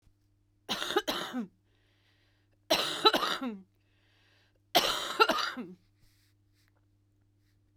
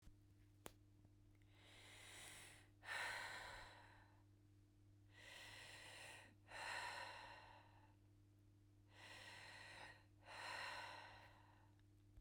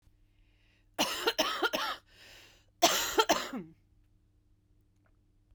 three_cough_length: 7.8 s
three_cough_amplitude: 13115
three_cough_signal_mean_std_ratio: 0.37
exhalation_length: 12.2 s
exhalation_amplitude: 832
exhalation_signal_mean_std_ratio: 0.72
cough_length: 5.5 s
cough_amplitude: 11187
cough_signal_mean_std_ratio: 0.39
survey_phase: beta (2021-08-13 to 2022-03-07)
age: 45-64
gender: Female
wearing_mask: 'No'
symptom_cough_any: true
symptom_runny_or_blocked_nose: true
symptom_shortness_of_breath: true
symptom_sore_throat: true
symptom_fatigue: true
symptom_headache: true
symptom_change_to_sense_of_smell_or_taste: true
symptom_onset: 4 days
smoker_status: Never smoked
respiratory_condition_asthma: false
respiratory_condition_other: false
recruitment_source: Test and Trace
submission_delay: 1 day
covid_test_result: Negative
covid_test_method: RT-qPCR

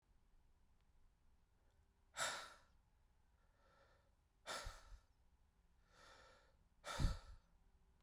exhalation_length: 8.0 s
exhalation_amplitude: 1712
exhalation_signal_mean_std_ratio: 0.31
survey_phase: beta (2021-08-13 to 2022-03-07)
age: 18-44
gender: Male
wearing_mask: 'No'
symptom_none: true
smoker_status: Never smoked
respiratory_condition_asthma: false
respiratory_condition_other: false
recruitment_source: REACT
submission_delay: 0 days
covid_test_result: Negative
covid_test_method: RT-qPCR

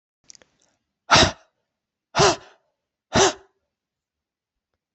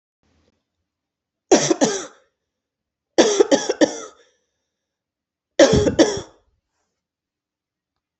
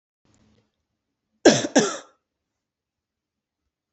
exhalation_length: 4.9 s
exhalation_amplitude: 24663
exhalation_signal_mean_std_ratio: 0.27
three_cough_length: 8.2 s
three_cough_amplitude: 29959
three_cough_signal_mean_std_ratio: 0.32
cough_length: 3.9 s
cough_amplitude: 27869
cough_signal_mean_std_ratio: 0.21
survey_phase: beta (2021-08-13 to 2022-03-07)
age: 45-64
gender: Female
wearing_mask: 'No'
symptom_runny_or_blocked_nose: true
symptom_fatigue: true
smoker_status: Never smoked
respiratory_condition_asthma: false
respiratory_condition_other: false
recruitment_source: REACT
submission_delay: 1 day
covid_test_result: Negative
covid_test_method: RT-qPCR
covid_ct_value: 38.0
covid_ct_gene: N gene
influenza_a_test_result: Negative
influenza_b_test_result: Negative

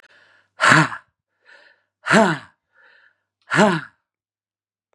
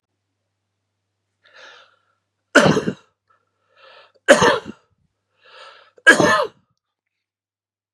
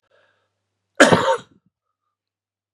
exhalation_length: 4.9 s
exhalation_amplitude: 32747
exhalation_signal_mean_std_ratio: 0.32
three_cough_length: 7.9 s
three_cough_amplitude: 32768
three_cough_signal_mean_std_ratio: 0.27
cough_length: 2.7 s
cough_amplitude: 32768
cough_signal_mean_std_ratio: 0.26
survey_phase: beta (2021-08-13 to 2022-03-07)
age: 45-64
gender: Male
wearing_mask: 'No'
symptom_cough_any: true
symptom_onset: 4 days
smoker_status: Never smoked
respiratory_condition_asthma: false
respiratory_condition_other: false
recruitment_source: Test and Trace
submission_delay: 1 day
covid_test_result: Positive
covid_test_method: RT-qPCR
covid_ct_value: 20.4
covid_ct_gene: ORF1ab gene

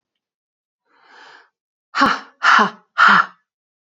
exhalation_length: 3.8 s
exhalation_amplitude: 28805
exhalation_signal_mean_std_ratio: 0.36
survey_phase: beta (2021-08-13 to 2022-03-07)
age: 18-44
gender: Female
wearing_mask: 'No'
symptom_cough_any: true
symptom_new_continuous_cough: true
symptom_runny_or_blocked_nose: true
symptom_sore_throat: true
symptom_fatigue: true
symptom_onset: 3 days
smoker_status: Never smoked
respiratory_condition_asthma: false
respiratory_condition_other: false
recruitment_source: Test and Trace
submission_delay: 1 day
covid_test_result: Negative
covid_test_method: RT-qPCR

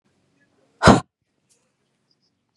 exhalation_length: 2.6 s
exhalation_amplitude: 32768
exhalation_signal_mean_std_ratio: 0.19
survey_phase: beta (2021-08-13 to 2022-03-07)
age: 18-44
gender: Female
wearing_mask: 'No'
symptom_none: true
smoker_status: Never smoked
respiratory_condition_asthma: false
respiratory_condition_other: false
recruitment_source: REACT
submission_delay: 1 day
covid_test_result: Negative
covid_test_method: RT-qPCR
influenza_a_test_result: Negative
influenza_b_test_result: Negative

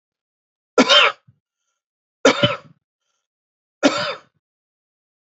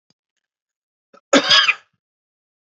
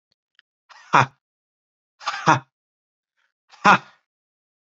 three_cough_length: 5.4 s
three_cough_amplitude: 32765
three_cough_signal_mean_std_ratio: 0.29
cough_length: 2.7 s
cough_amplitude: 29946
cough_signal_mean_std_ratio: 0.28
exhalation_length: 4.6 s
exhalation_amplitude: 29176
exhalation_signal_mean_std_ratio: 0.22
survey_phase: beta (2021-08-13 to 2022-03-07)
age: 18-44
gender: Male
wearing_mask: 'No'
symptom_runny_or_blocked_nose: true
symptom_onset: 5 days
smoker_status: Never smoked
respiratory_condition_asthma: false
respiratory_condition_other: false
recruitment_source: Test and Trace
submission_delay: 1 day
covid_test_result: Positive
covid_test_method: RT-qPCR
covid_ct_value: 26.6
covid_ct_gene: ORF1ab gene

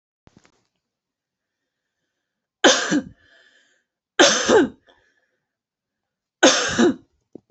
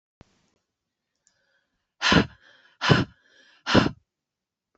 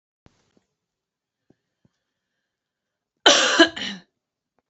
three_cough_length: 7.5 s
three_cough_amplitude: 28949
three_cough_signal_mean_std_ratio: 0.32
exhalation_length: 4.8 s
exhalation_amplitude: 27792
exhalation_signal_mean_std_ratio: 0.28
cough_length: 4.7 s
cough_amplitude: 31231
cough_signal_mean_std_ratio: 0.24
survey_phase: beta (2021-08-13 to 2022-03-07)
age: 45-64
gender: Female
wearing_mask: 'No'
symptom_none: true
smoker_status: Never smoked
respiratory_condition_asthma: true
respiratory_condition_other: false
recruitment_source: REACT
submission_delay: 1 day
covid_test_result: Negative
covid_test_method: RT-qPCR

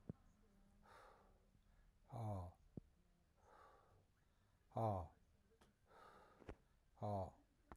exhalation_length: 7.8 s
exhalation_amplitude: 824
exhalation_signal_mean_std_ratio: 0.39
survey_phase: alpha (2021-03-01 to 2021-08-12)
age: 45-64
gender: Male
wearing_mask: 'No'
symptom_none: true
smoker_status: Never smoked
respiratory_condition_asthma: false
respiratory_condition_other: false
recruitment_source: REACT
submission_delay: 2 days
covid_test_result: Negative
covid_test_method: RT-qPCR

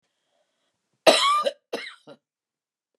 cough_length: 3.0 s
cough_amplitude: 27152
cough_signal_mean_std_ratio: 0.31
survey_phase: beta (2021-08-13 to 2022-03-07)
age: 65+
gender: Female
wearing_mask: 'No'
symptom_headache: true
smoker_status: Ex-smoker
respiratory_condition_asthma: false
respiratory_condition_other: false
recruitment_source: REACT
submission_delay: 1 day
covid_test_result: Negative
covid_test_method: RT-qPCR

